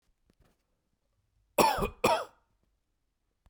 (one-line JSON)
{"cough_length": "3.5 s", "cough_amplitude": 12432, "cough_signal_mean_std_ratio": 0.29, "survey_phase": "beta (2021-08-13 to 2022-03-07)", "age": "18-44", "gender": "Male", "wearing_mask": "No", "symptom_none": true, "smoker_status": "Never smoked", "respiratory_condition_asthma": false, "respiratory_condition_other": false, "recruitment_source": "REACT", "submission_delay": "1 day", "covid_test_result": "Negative", "covid_test_method": "RT-qPCR", "influenza_a_test_result": "Negative", "influenza_b_test_result": "Negative"}